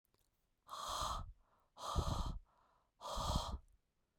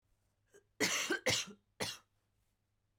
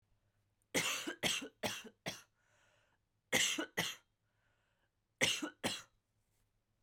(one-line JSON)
{"exhalation_length": "4.2 s", "exhalation_amplitude": 2133, "exhalation_signal_mean_std_ratio": 0.54, "cough_length": "3.0 s", "cough_amplitude": 3491, "cough_signal_mean_std_ratio": 0.4, "three_cough_length": "6.8 s", "three_cough_amplitude": 5381, "three_cough_signal_mean_std_ratio": 0.39, "survey_phase": "beta (2021-08-13 to 2022-03-07)", "age": "18-44", "gender": "Female", "wearing_mask": "No", "symptom_none": true, "smoker_status": "Never smoked", "respiratory_condition_asthma": true, "respiratory_condition_other": false, "recruitment_source": "REACT", "submission_delay": "2 days", "covid_test_result": "Negative", "covid_test_method": "RT-qPCR", "influenza_a_test_result": "Negative", "influenza_b_test_result": "Negative"}